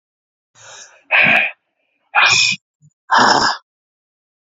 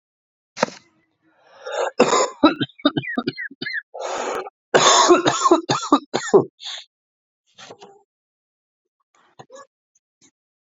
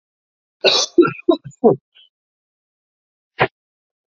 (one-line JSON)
{"exhalation_length": "4.5 s", "exhalation_amplitude": 30796, "exhalation_signal_mean_std_ratio": 0.44, "three_cough_length": "10.7 s", "three_cough_amplitude": 32767, "three_cough_signal_mean_std_ratio": 0.38, "cough_length": "4.2 s", "cough_amplitude": 28432, "cough_signal_mean_std_ratio": 0.3, "survey_phase": "beta (2021-08-13 to 2022-03-07)", "age": "18-44", "gender": "Male", "wearing_mask": "No", "symptom_cough_any": true, "symptom_new_continuous_cough": true, "symptom_runny_or_blocked_nose": true, "symptom_shortness_of_breath": true, "symptom_sore_throat": true, "symptom_abdominal_pain": true, "symptom_diarrhoea": true, "symptom_fatigue": true, "symptom_headache": true, "symptom_onset": "6 days", "smoker_status": "Current smoker (e-cigarettes or vapes only)", "respiratory_condition_asthma": false, "respiratory_condition_other": false, "recruitment_source": "Test and Trace", "submission_delay": "1 day", "covid_test_result": "Positive", "covid_test_method": "RT-qPCR", "covid_ct_value": 12.4, "covid_ct_gene": "ORF1ab gene"}